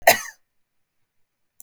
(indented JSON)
{
  "cough_length": "1.6 s",
  "cough_amplitude": 32768,
  "cough_signal_mean_std_ratio": 0.2,
  "survey_phase": "beta (2021-08-13 to 2022-03-07)",
  "age": "45-64",
  "gender": "Female",
  "wearing_mask": "No",
  "symptom_none": true,
  "smoker_status": "Never smoked",
  "respiratory_condition_asthma": true,
  "respiratory_condition_other": false,
  "recruitment_source": "REACT",
  "submission_delay": "2 days",
  "covid_test_result": "Negative",
  "covid_test_method": "RT-qPCR",
  "influenza_a_test_result": "Unknown/Void",
  "influenza_b_test_result": "Unknown/Void"
}